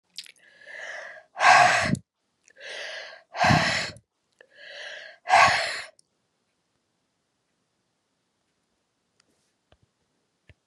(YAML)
exhalation_length: 10.7 s
exhalation_amplitude: 22861
exhalation_signal_mean_std_ratio: 0.32
survey_phase: beta (2021-08-13 to 2022-03-07)
age: 45-64
gender: Female
wearing_mask: 'No'
symptom_none: true
smoker_status: Never smoked
respiratory_condition_asthma: false
respiratory_condition_other: false
recruitment_source: REACT
submission_delay: 2 days
covid_test_result: Negative
covid_test_method: RT-qPCR